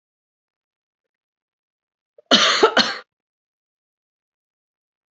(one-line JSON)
{"cough_length": "5.1 s", "cough_amplitude": 31767, "cough_signal_mean_std_ratio": 0.25, "survey_phase": "beta (2021-08-13 to 2022-03-07)", "age": "18-44", "gender": "Female", "wearing_mask": "No", "symptom_runny_or_blocked_nose": true, "smoker_status": "Never smoked", "respiratory_condition_asthma": false, "respiratory_condition_other": false, "recruitment_source": "Test and Trace", "submission_delay": "1 day", "covid_test_result": "Positive", "covid_test_method": "RT-qPCR", "covid_ct_value": 23.7, "covid_ct_gene": "ORF1ab gene", "covid_ct_mean": 24.6, "covid_viral_load": "8300 copies/ml", "covid_viral_load_category": "Minimal viral load (< 10K copies/ml)"}